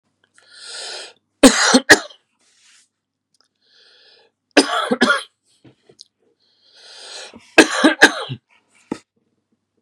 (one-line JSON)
{"three_cough_length": "9.8 s", "three_cough_amplitude": 32768, "three_cough_signal_mean_std_ratio": 0.28, "survey_phase": "beta (2021-08-13 to 2022-03-07)", "age": "45-64", "gender": "Male", "wearing_mask": "No", "symptom_cough_any": true, "symptom_onset": "10 days", "smoker_status": "Never smoked", "respiratory_condition_asthma": false, "respiratory_condition_other": false, "recruitment_source": "Test and Trace", "submission_delay": "2 days", "covid_test_result": "Positive", "covid_test_method": "RT-qPCR", "covid_ct_value": 19.9, "covid_ct_gene": "ORF1ab gene", "covid_ct_mean": 20.7, "covid_viral_load": "160000 copies/ml", "covid_viral_load_category": "Low viral load (10K-1M copies/ml)"}